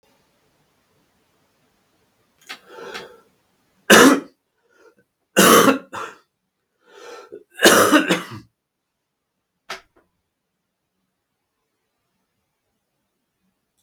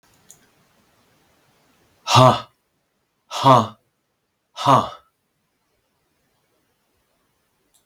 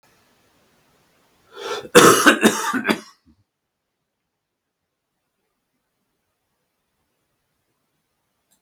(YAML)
three_cough_length: 13.8 s
three_cough_amplitude: 32768
three_cough_signal_mean_std_ratio: 0.25
exhalation_length: 7.9 s
exhalation_amplitude: 32766
exhalation_signal_mean_std_ratio: 0.24
cough_length: 8.6 s
cough_amplitude: 32768
cough_signal_mean_std_ratio: 0.24
survey_phase: beta (2021-08-13 to 2022-03-07)
age: 65+
gender: Male
wearing_mask: 'No'
symptom_cough_any: true
symptom_runny_or_blocked_nose: true
symptom_fatigue: true
symptom_onset: 3 days
smoker_status: Never smoked
respiratory_condition_asthma: false
respiratory_condition_other: false
recruitment_source: Test and Trace
submission_delay: 1 day
covid_test_result: Positive
covid_test_method: RT-qPCR
covid_ct_value: 13.0
covid_ct_gene: ORF1ab gene
covid_ct_mean: 13.9
covid_viral_load: 28000000 copies/ml
covid_viral_load_category: High viral load (>1M copies/ml)